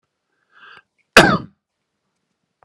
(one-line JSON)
{"cough_length": "2.6 s", "cough_amplitude": 32768, "cough_signal_mean_std_ratio": 0.21, "survey_phase": "beta (2021-08-13 to 2022-03-07)", "age": "18-44", "gender": "Male", "wearing_mask": "No", "symptom_runny_or_blocked_nose": true, "symptom_shortness_of_breath": true, "symptom_diarrhoea": true, "symptom_fatigue": true, "smoker_status": "Ex-smoker", "respiratory_condition_asthma": false, "respiratory_condition_other": false, "recruitment_source": "Test and Trace", "submission_delay": "3 days", "covid_test_method": "RT-qPCR", "covid_ct_value": 19.5, "covid_ct_gene": "ORF1ab gene", "covid_ct_mean": 19.9, "covid_viral_load": "290000 copies/ml", "covid_viral_load_category": "Low viral load (10K-1M copies/ml)"}